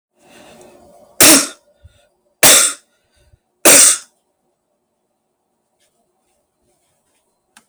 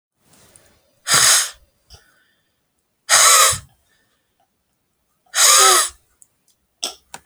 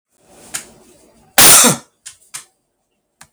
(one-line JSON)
{"three_cough_length": "7.7 s", "three_cough_amplitude": 32768, "three_cough_signal_mean_std_ratio": 0.28, "exhalation_length": "7.3 s", "exhalation_amplitude": 32768, "exhalation_signal_mean_std_ratio": 0.37, "cough_length": "3.3 s", "cough_amplitude": 32768, "cough_signal_mean_std_ratio": 0.31, "survey_phase": "beta (2021-08-13 to 2022-03-07)", "age": "45-64", "gender": "Male", "wearing_mask": "No", "symptom_none": true, "smoker_status": "Never smoked", "respiratory_condition_asthma": false, "respiratory_condition_other": false, "recruitment_source": "REACT", "submission_delay": "1 day", "covid_test_result": "Negative", "covid_test_method": "RT-qPCR"}